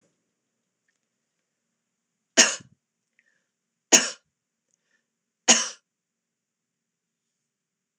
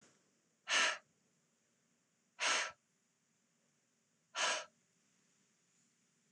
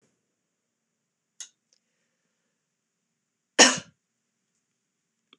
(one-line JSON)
{"three_cough_length": "8.0 s", "three_cough_amplitude": 26028, "three_cough_signal_mean_std_ratio": 0.17, "exhalation_length": "6.3 s", "exhalation_amplitude": 3033, "exhalation_signal_mean_std_ratio": 0.3, "cough_length": "5.4 s", "cough_amplitude": 25680, "cough_signal_mean_std_ratio": 0.13, "survey_phase": "beta (2021-08-13 to 2022-03-07)", "age": "65+", "gender": "Female", "wearing_mask": "No", "symptom_none": true, "smoker_status": "Ex-smoker", "respiratory_condition_asthma": false, "respiratory_condition_other": false, "recruitment_source": "REACT", "submission_delay": "2 days", "covid_test_result": "Negative", "covid_test_method": "RT-qPCR", "influenza_a_test_result": "Negative", "influenza_b_test_result": "Negative"}